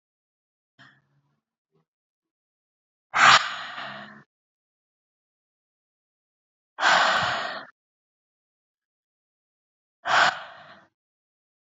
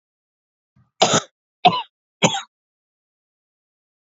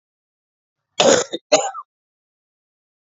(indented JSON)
{
  "exhalation_length": "11.8 s",
  "exhalation_amplitude": 25930,
  "exhalation_signal_mean_std_ratio": 0.27,
  "three_cough_length": "4.2 s",
  "three_cough_amplitude": 29096,
  "three_cough_signal_mean_std_ratio": 0.25,
  "cough_length": "3.2 s",
  "cough_amplitude": 31030,
  "cough_signal_mean_std_ratio": 0.29,
  "survey_phase": "beta (2021-08-13 to 2022-03-07)",
  "age": "45-64",
  "gender": "Female",
  "wearing_mask": "No",
  "symptom_runny_or_blocked_nose": true,
  "symptom_sore_throat": true,
  "symptom_onset": "12 days",
  "smoker_status": "Current smoker (11 or more cigarettes per day)",
  "respiratory_condition_asthma": false,
  "respiratory_condition_other": false,
  "recruitment_source": "REACT",
  "submission_delay": "2 days",
  "covid_test_result": "Negative",
  "covid_test_method": "RT-qPCR",
  "influenza_a_test_result": "Negative",
  "influenza_b_test_result": "Negative"
}